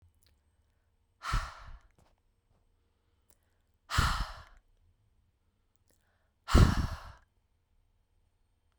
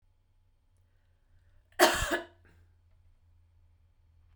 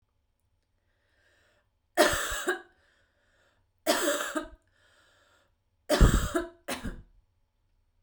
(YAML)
exhalation_length: 8.8 s
exhalation_amplitude: 13392
exhalation_signal_mean_std_ratio: 0.24
cough_length: 4.4 s
cough_amplitude: 19447
cough_signal_mean_std_ratio: 0.23
three_cough_length: 8.0 s
three_cough_amplitude: 16133
three_cough_signal_mean_std_ratio: 0.33
survey_phase: beta (2021-08-13 to 2022-03-07)
age: 18-44
gender: Female
wearing_mask: 'No'
symptom_abdominal_pain: true
symptom_diarrhoea: true
symptom_fatigue: true
symptom_onset: 5 days
smoker_status: Never smoked
respiratory_condition_asthma: false
respiratory_condition_other: false
recruitment_source: REACT
submission_delay: 1 day
covid_test_result: Negative
covid_test_method: RT-qPCR